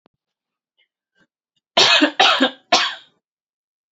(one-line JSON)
{"three_cough_length": "3.9 s", "three_cough_amplitude": 30553, "three_cough_signal_mean_std_ratio": 0.36, "survey_phase": "alpha (2021-03-01 to 2021-08-12)", "age": "18-44", "gender": "Female", "wearing_mask": "No", "symptom_none": true, "smoker_status": "Never smoked", "respiratory_condition_asthma": false, "respiratory_condition_other": false, "recruitment_source": "REACT", "submission_delay": "2 days", "covid_test_result": "Negative", "covid_test_method": "RT-qPCR"}